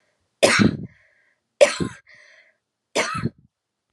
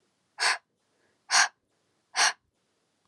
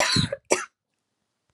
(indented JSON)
{
  "three_cough_length": "3.9 s",
  "three_cough_amplitude": 30082,
  "three_cough_signal_mean_std_ratio": 0.33,
  "exhalation_length": "3.1 s",
  "exhalation_amplitude": 12747,
  "exhalation_signal_mean_std_ratio": 0.31,
  "cough_length": "1.5 s",
  "cough_amplitude": 20740,
  "cough_signal_mean_std_ratio": 0.42,
  "survey_phase": "alpha (2021-03-01 to 2021-08-12)",
  "age": "18-44",
  "gender": "Female",
  "wearing_mask": "No",
  "symptom_cough_any": true,
  "symptom_shortness_of_breath": true,
  "symptom_abdominal_pain": true,
  "symptom_fatigue": true,
  "symptom_fever_high_temperature": true,
  "symptom_headache": true,
  "smoker_status": "Current smoker (e-cigarettes or vapes only)",
  "respiratory_condition_asthma": false,
  "respiratory_condition_other": false,
  "recruitment_source": "Test and Trace",
  "submission_delay": "2 days",
  "covid_test_result": "Positive",
  "covid_test_method": "LFT"
}